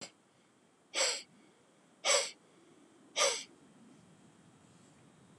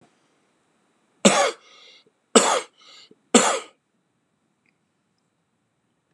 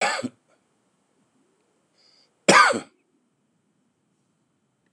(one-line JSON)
{"exhalation_length": "5.4 s", "exhalation_amplitude": 5548, "exhalation_signal_mean_std_ratio": 0.33, "three_cough_length": "6.1 s", "three_cough_amplitude": 32415, "three_cough_signal_mean_std_ratio": 0.26, "cough_length": "4.9 s", "cough_amplitude": 27417, "cough_signal_mean_std_ratio": 0.23, "survey_phase": "beta (2021-08-13 to 2022-03-07)", "age": "45-64", "gender": "Male", "wearing_mask": "No", "symptom_cough_any": true, "symptom_new_continuous_cough": true, "symptom_sore_throat": true, "symptom_diarrhoea": true, "symptom_fatigue": true, "symptom_fever_high_temperature": true, "symptom_headache": true, "symptom_change_to_sense_of_smell_or_taste": true, "symptom_other": true, "symptom_onset": "3 days", "smoker_status": "Never smoked", "respiratory_condition_asthma": false, "respiratory_condition_other": false, "recruitment_source": "Test and Trace", "submission_delay": "1 day", "covid_test_result": "Positive", "covid_test_method": "RT-qPCR", "covid_ct_value": 19.9, "covid_ct_gene": "N gene"}